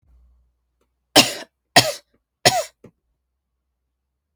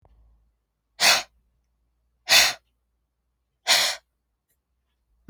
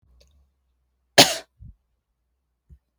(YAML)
three_cough_length: 4.4 s
three_cough_amplitude: 32768
three_cough_signal_mean_std_ratio: 0.23
exhalation_length: 5.3 s
exhalation_amplitude: 31567
exhalation_signal_mean_std_ratio: 0.28
cough_length: 3.0 s
cough_amplitude: 32768
cough_signal_mean_std_ratio: 0.16
survey_phase: beta (2021-08-13 to 2022-03-07)
age: 18-44
gender: Female
wearing_mask: 'No'
symptom_cough_any: true
symptom_runny_or_blocked_nose: true
symptom_fatigue: true
symptom_headache: true
symptom_change_to_sense_of_smell_or_taste: true
symptom_loss_of_taste: true
smoker_status: Never smoked
respiratory_condition_asthma: false
respiratory_condition_other: false
recruitment_source: Test and Trace
submission_delay: 0 days
covid_test_result: Positive
covid_test_method: LFT